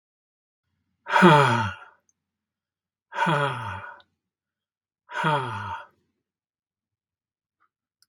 {"exhalation_length": "8.1 s", "exhalation_amplitude": 32717, "exhalation_signal_mean_std_ratio": 0.32, "survey_phase": "beta (2021-08-13 to 2022-03-07)", "age": "45-64", "gender": "Male", "wearing_mask": "No", "symptom_none": true, "smoker_status": "Never smoked", "respiratory_condition_asthma": false, "respiratory_condition_other": false, "recruitment_source": "REACT", "submission_delay": "3 days", "covid_test_result": "Negative", "covid_test_method": "RT-qPCR", "influenza_a_test_result": "Negative", "influenza_b_test_result": "Negative"}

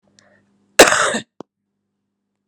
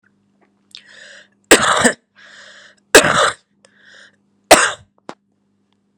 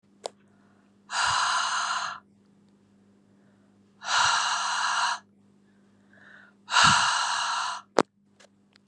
{"cough_length": "2.5 s", "cough_amplitude": 32768, "cough_signal_mean_std_ratio": 0.26, "three_cough_length": "6.0 s", "three_cough_amplitude": 32768, "three_cough_signal_mean_std_ratio": 0.3, "exhalation_length": "8.9 s", "exhalation_amplitude": 28371, "exhalation_signal_mean_std_ratio": 0.5, "survey_phase": "beta (2021-08-13 to 2022-03-07)", "age": "18-44", "gender": "Female", "wearing_mask": "No", "symptom_cough_any": true, "symptom_runny_or_blocked_nose": true, "symptom_onset": "4 days", "smoker_status": "Never smoked", "respiratory_condition_asthma": true, "respiratory_condition_other": false, "recruitment_source": "REACT", "submission_delay": "0 days", "covid_test_result": "Negative", "covid_test_method": "RT-qPCR"}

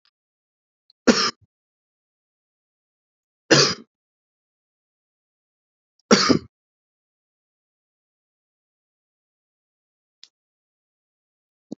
{"three_cough_length": "11.8 s", "three_cough_amplitude": 32107, "three_cough_signal_mean_std_ratio": 0.18, "survey_phase": "beta (2021-08-13 to 2022-03-07)", "age": "45-64", "gender": "Male", "wearing_mask": "No", "symptom_none": true, "smoker_status": "Never smoked", "respiratory_condition_asthma": false, "respiratory_condition_other": false, "recruitment_source": "REACT", "submission_delay": "1 day", "covid_test_result": "Negative", "covid_test_method": "RT-qPCR", "influenza_a_test_result": "Negative", "influenza_b_test_result": "Negative"}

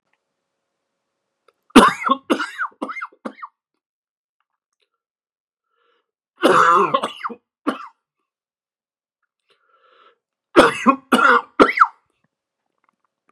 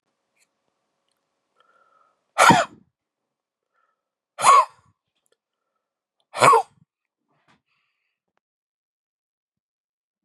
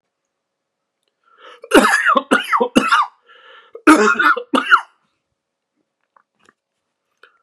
{"three_cough_length": "13.3 s", "three_cough_amplitude": 32768, "three_cough_signal_mean_std_ratio": 0.3, "exhalation_length": "10.2 s", "exhalation_amplitude": 30333, "exhalation_signal_mean_std_ratio": 0.21, "cough_length": "7.4 s", "cough_amplitude": 32768, "cough_signal_mean_std_ratio": 0.38, "survey_phase": "beta (2021-08-13 to 2022-03-07)", "age": "45-64", "gender": "Male", "wearing_mask": "No", "symptom_cough_any": true, "symptom_runny_or_blocked_nose": true, "symptom_fatigue": true, "smoker_status": "Never smoked", "respiratory_condition_asthma": false, "respiratory_condition_other": false, "recruitment_source": "Test and Trace", "submission_delay": "1 day", "covid_test_result": "Positive", "covid_test_method": "RT-qPCR", "covid_ct_value": 22.5, "covid_ct_gene": "ORF1ab gene", "covid_ct_mean": 23.3, "covid_viral_load": "23000 copies/ml", "covid_viral_load_category": "Low viral load (10K-1M copies/ml)"}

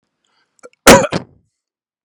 {"cough_length": "2.0 s", "cough_amplitude": 32768, "cough_signal_mean_std_ratio": 0.27, "survey_phase": "beta (2021-08-13 to 2022-03-07)", "age": "18-44", "gender": "Male", "wearing_mask": "No", "symptom_none": true, "smoker_status": "Ex-smoker", "respiratory_condition_asthma": false, "respiratory_condition_other": false, "recruitment_source": "REACT", "submission_delay": "1 day", "covid_test_result": "Negative", "covid_test_method": "RT-qPCR", "influenza_a_test_result": "Negative", "influenza_b_test_result": "Negative"}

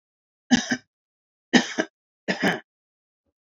{"three_cough_length": "3.4 s", "three_cough_amplitude": 24507, "three_cough_signal_mean_std_ratio": 0.3, "survey_phase": "beta (2021-08-13 to 2022-03-07)", "age": "45-64", "gender": "Male", "wearing_mask": "No", "symptom_cough_any": true, "symptom_onset": "12 days", "smoker_status": "Never smoked", "respiratory_condition_asthma": false, "respiratory_condition_other": false, "recruitment_source": "REACT", "submission_delay": "2 days", "covid_test_result": "Negative", "covid_test_method": "RT-qPCR"}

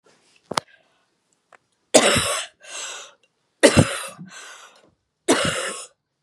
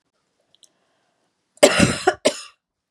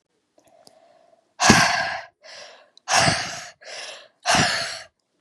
{"three_cough_length": "6.2 s", "three_cough_amplitude": 32767, "three_cough_signal_mean_std_ratio": 0.34, "cough_length": "2.9 s", "cough_amplitude": 32768, "cough_signal_mean_std_ratio": 0.29, "exhalation_length": "5.2 s", "exhalation_amplitude": 32767, "exhalation_signal_mean_std_ratio": 0.44, "survey_phase": "beta (2021-08-13 to 2022-03-07)", "age": "18-44", "gender": "Female", "wearing_mask": "No", "symptom_cough_any": true, "symptom_runny_or_blocked_nose": true, "symptom_shortness_of_breath": true, "symptom_sore_throat": true, "symptom_fatigue": true, "symptom_headache": true, "smoker_status": "Never smoked", "respiratory_condition_asthma": false, "respiratory_condition_other": false, "recruitment_source": "Test and Trace", "submission_delay": "2 days", "covid_test_result": "Positive", "covid_test_method": "RT-qPCR", "covid_ct_value": 36.3, "covid_ct_gene": "N gene"}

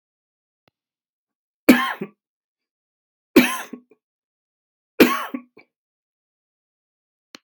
{"three_cough_length": "7.4 s", "three_cough_amplitude": 32767, "three_cough_signal_mean_std_ratio": 0.21, "survey_phase": "beta (2021-08-13 to 2022-03-07)", "age": "45-64", "gender": "Male", "wearing_mask": "No", "symptom_none": true, "smoker_status": "Never smoked", "respiratory_condition_asthma": false, "respiratory_condition_other": false, "recruitment_source": "REACT", "submission_delay": "2 days", "covid_test_result": "Negative", "covid_test_method": "RT-qPCR"}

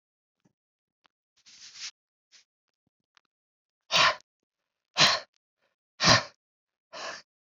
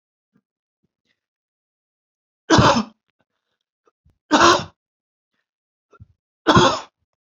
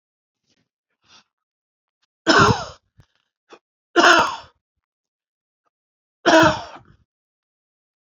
{"exhalation_length": "7.5 s", "exhalation_amplitude": 16305, "exhalation_signal_mean_std_ratio": 0.24, "three_cough_length": "7.3 s", "three_cough_amplitude": 30910, "three_cough_signal_mean_std_ratio": 0.28, "cough_length": "8.0 s", "cough_amplitude": 28365, "cough_signal_mean_std_ratio": 0.28, "survey_phase": "beta (2021-08-13 to 2022-03-07)", "age": "45-64", "gender": "Male", "wearing_mask": "No", "symptom_none": true, "smoker_status": "Never smoked", "respiratory_condition_asthma": false, "respiratory_condition_other": false, "recruitment_source": "REACT", "submission_delay": "1 day", "covid_test_result": "Negative", "covid_test_method": "RT-qPCR"}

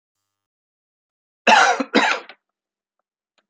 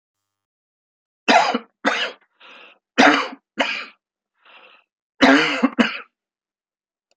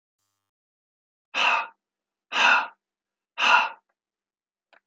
{"cough_length": "3.5 s", "cough_amplitude": 28361, "cough_signal_mean_std_ratio": 0.31, "three_cough_length": "7.2 s", "three_cough_amplitude": 32767, "three_cough_signal_mean_std_ratio": 0.36, "exhalation_length": "4.9 s", "exhalation_amplitude": 18490, "exhalation_signal_mean_std_ratio": 0.34, "survey_phase": "alpha (2021-03-01 to 2021-08-12)", "age": "65+", "gender": "Male", "wearing_mask": "No", "symptom_none": true, "smoker_status": "Never smoked", "respiratory_condition_asthma": false, "respiratory_condition_other": false, "recruitment_source": "REACT", "submission_delay": "1 day", "covid_test_result": "Negative", "covid_test_method": "RT-qPCR"}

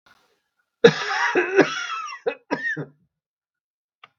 {"cough_length": "4.2 s", "cough_amplitude": 32768, "cough_signal_mean_std_ratio": 0.39, "survey_phase": "beta (2021-08-13 to 2022-03-07)", "age": "65+", "gender": "Male", "wearing_mask": "No", "symptom_cough_any": true, "symptom_new_continuous_cough": true, "symptom_sore_throat": true, "symptom_onset": "2 days", "smoker_status": "Ex-smoker", "respiratory_condition_asthma": false, "respiratory_condition_other": false, "recruitment_source": "Test and Trace", "submission_delay": "1 day", "covid_test_result": "Negative", "covid_test_method": "RT-qPCR"}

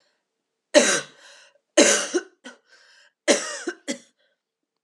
{"three_cough_length": "4.8 s", "three_cough_amplitude": 27959, "three_cough_signal_mean_std_ratio": 0.33, "survey_phase": "beta (2021-08-13 to 2022-03-07)", "age": "18-44", "gender": "Female", "wearing_mask": "No", "symptom_cough_any": true, "symptom_runny_or_blocked_nose": true, "symptom_change_to_sense_of_smell_or_taste": true, "symptom_loss_of_taste": true, "symptom_onset": "3 days", "smoker_status": "Never smoked", "respiratory_condition_asthma": false, "respiratory_condition_other": false, "recruitment_source": "Test and Trace", "submission_delay": "2 days", "covid_test_result": "Positive", "covid_test_method": "ePCR"}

